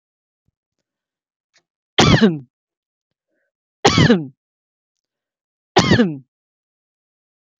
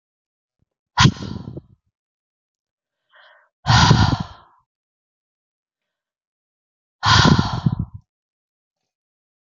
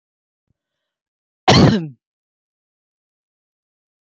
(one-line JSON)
{"three_cough_length": "7.6 s", "three_cough_amplitude": 32768, "three_cough_signal_mean_std_ratio": 0.3, "exhalation_length": "9.5 s", "exhalation_amplitude": 30761, "exhalation_signal_mean_std_ratio": 0.3, "cough_length": "4.0 s", "cough_amplitude": 30547, "cough_signal_mean_std_ratio": 0.24, "survey_phase": "beta (2021-08-13 to 2022-03-07)", "age": "45-64", "gender": "Female", "wearing_mask": "No", "symptom_none": true, "smoker_status": "Never smoked", "respiratory_condition_asthma": false, "respiratory_condition_other": false, "recruitment_source": "REACT", "submission_delay": "1 day", "covid_test_result": "Negative", "covid_test_method": "RT-qPCR"}